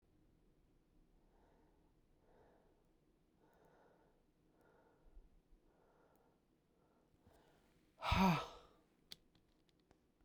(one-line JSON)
{"exhalation_length": "10.2 s", "exhalation_amplitude": 2336, "exhalation_signal_mean_std_ratio": 0.2, "survey_phase": "beta (2021-08-13 to 2022-03-07)", "age": "45-64", "gender": "Female", "wearing_mask": "No", "symptom_cough_any": true, "symptom_runny_or_blocked_nose": true, "symptom_shortness_of_breath": true, "symptom_sore_throat": true, "symptom_fatigue": true, "symptom_headache": true, "symptom_change_to_sense_of_smell_or_taste": true, "symptom_loss_of_taste": true, "symptom_other": true, "symptom_onset": "5 days", "smoker_status": "Never smoked", "respiratory_condition_asthma": false, "respiratory_condition_other": false, "recruitment_source": "Test and Trace", "submission_delay": "2 days", "covid_test_result": "Positive", "covid_test_method": "RT-qPCR", "covid_ct_value": 19.9, "covid_ct_gene": "ORF1ab gene", "covid_ct_mean": 20.0, "covid_viral_load": "270000 copies/ml", "covid_viral_load_category": "Low viral load (10K-1M copies/ml)"}